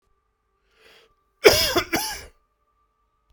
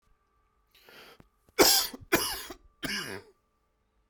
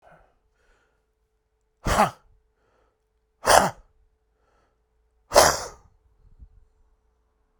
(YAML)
cough_length: 3.3 s
cough_amplitude: 32768
cough_signal_mean_std_ratio: 0.28
three_cough_length: 4.1 s
three_cough_amplitude: 15369
three_cough_signal_mean_std_ratio: 0.32
exhalation_length: 7.6 s
exhalation_amplitude: 32768
exhalation_signal_mean_std_ratio: 0.23
survey_phase: beta (2021-08-13 to 2022-03-07)
age: 18-44
gender: Male
wearing_mask: 'No'
symptom_cough_any: true
symptom_runny_or_blocked_nose: true
symptom_sore_throat: true
symptom_fatigue: true
symptom_change_to_sense_of_smell_or_taste: true
symptom_loss_of_taste: true
symptom_onset: 3 days
smoker_status: Ex-smoker
respiratory_condition_asthma: true
respiratory_condition_other: false
recruitment_source: Test and Trace
submission_delay: 2 days
covid_test_result: Positive
covid_test_method: RT-qPCR